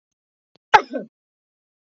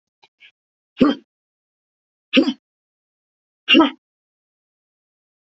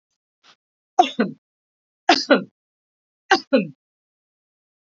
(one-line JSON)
{"cough_length": "2.0 s", "cough_amplitude": 28586, "cough_signal_mean_std_ratio": 0.17, "exhalation_length": "5.5 s", "exhalation_amplitude": 27536, "exhalation_signal_mean_std_ratio": 0.24, "three_cough_length": "4.9 s", "three_cough_amplitude": 28560, "three_cough_signal_mean_std_ratio": 0.26, "survey_phase": "beta (2021-08-13 to 2022-03-07)", "age": "45-64", "gender": "Female", "wearing_mask": "No", "symptom_none": true, "smoker_status": "Never smoked", "respiratory_condition_asthma": false, "respiratory_condition_other": false, "recruitment_source": "REACT", "submission_delay": "1 day", "covid_test_result": "Negative", "covid_test_method": "RT-qPCR", "influenza_a_test_result": "Negative", "influenza_b_test_result": "Negative"}